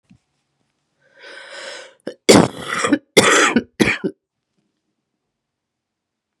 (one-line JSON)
{"cough_length": "6.4 s", "cough_amplitude": 32768, "cough_signal_mean_std_ratio": 0.32, "survey_phase": "beta (2021-08-13 to 2022-03-07)", "age": "18-44", "gender": "Female", "wearing_mask": "No", "symptom_none": true, "smoker_status": "Current smoker (1 to 10 cigarettes per day)", "respiratory_condition_asthma": true, "respiratory_condition_other": false, "recruitment_source": "Test and Trace", "submission_delay": "2 days", "covid_test_result": "Negative", "covid_test_method": "RT-qPCR"}